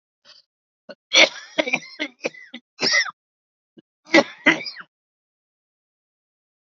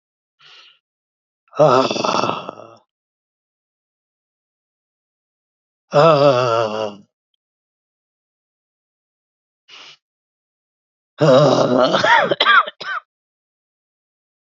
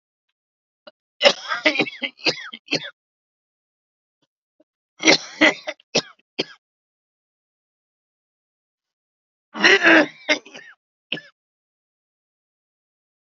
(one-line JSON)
{"cough_length": "6.7 s", "cough_amplitude": 30934, "cough_signal_mean_std_ratio": 0.28, "exhalation_length": "14.5 s", "exhalation_amplitude": 32386, "exhalation_signal_mean_std_ratio": 0.36, "three_cough_length": "13.3 s", "three_cough_amplitude": 30124, "three_cough_signal_mean_std_ratio": 0.26, "survey_phase": "alpha (2021-03-01 to 2021-08-12)", "age": "45-64", "gender": "Male", "wearing_mask": "No", "symptom_cough_any": true, "symptom_fatigue": true, "symptom_onset": "9 days", "smoker_status": "Never smoked", "respiratory_condition_asthma": false, "respiratory_condition_other": false, "recruitment_source": "Test and Trace", "submission_delay": "1 day", "covid_test_result": "Positive", "covid_test_method": "RT-qPCR", "covid_ct_value": 33.9, "covid_ct_gene": "ORF1ab gene", "covid_ct_mean": 33.9, "covid_viral_load": "7.7 copies/ml", "covid_viral_load_category": "Minimal viral load (< 10K copies/ml)"}